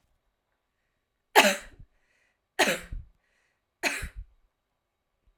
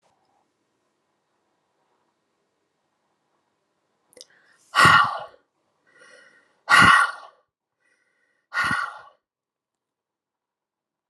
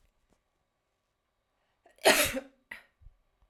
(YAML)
three_cough_length: 5.4 s
three_cough_amplitude: 25838
three_cough_signal_mean_std_ratio: 0.25
exhalation_length: 11.1 s
exhalation_amplitude: 30906
exhalation_signal_mean_std_ratio: 0.24
cough_length: 3.5 s
cough_amplitude: 13550
cough_signal_mean_std_ratio: 0.23
survey_phase: alpha (2021-03-01 to 2021-08-12)
age: 18-44
gender: Female
wearing_mask: 'No'
symptom_none: true
symptom_onset: 5 days
smoker_status: Current smoker (e-cigarettes or vapes only)
respiratory_condition_asthma: false
respiratory_condition_other: false
recruitment_source: REACT
submission_delay: 1 day
covid_test_result: Negative
covid_test_method: RT-qPCR